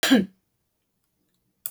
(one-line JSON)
{"cough_length": "1.7 s", "cough_amplitude": 15731, "cough_signal_mean_std_ratio": 0.29, "survey_phase": "beta (2021-08-13 to 2022-03-07)", "age": "65+", "gender": "Female", "wearing_mask": "No", "symptom_none": true, "smoker_status": "Current smoker (1 to 10 cigarettes per day)", "respiratory_condition_asthma": false, "respiratory_condition_other": false, "recruitment_source": "REACT", "submission_delay": "1 day", "covid_test_result": "Negative", "covid_test_method": "RT-qPCR"}